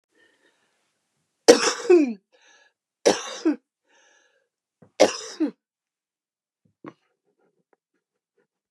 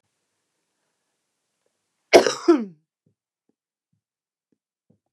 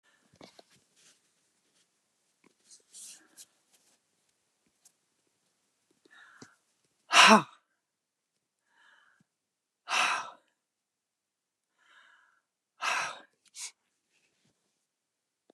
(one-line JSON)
{"three_cough_length": "8.7 s", "three_cough_amplitude": 32768, "three_cough_signal_mean_std_ratio": 0.24, "cough_length": "5.1 s", "cough_amplitude": 32768, "cough_signal_mean_std_ratio": 0.18, "exhalation_length": "15.5 s", "exhalation_amplitude": 19449, "exhalation_signal_mean_std_ratio": 0.17, "survey_phase": "beta (2021-08-13 to 2022-03-07)", "age": "65+", "gender": "Female", "wearing_mask": "No", "symptom_none": true, "smoker_status": "Never smoked", "respiratory_condition_asthma": true, "respiratory_condition_other": false, "recruitment_source": "REACT", "submission_delay": "2 days", "covid_test_result": "Negative", "covid_test_method": "RT-qPCR", "influenza_a_test_result": "Negative", "influenza_b_test_result": "Negative"}